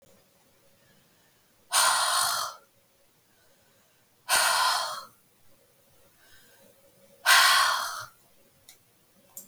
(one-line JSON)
{"exhalation_length": "9.5 s", "exhalation_amplitude": 17109, "exhalation_signal_mean_std_ratio": 0.39, "survey_phase": "beta (2021-08-13 to 2022-03-07)", "age": "65+", "gender": "Female", "wearing_mask": "No", "symptom_none": true, "smoker_status": "Never smoked", "respiratory_condition_asthma": false, "respiratory_condition_other": false, "recruitment_source": "REACT", "submission_delay": "1 day", "covid_test_result": "Negative", "covid_test_method": "RT-qPCR", "influenza_a_test_result": "Negative", "influenza_b_test_result": "Negative"}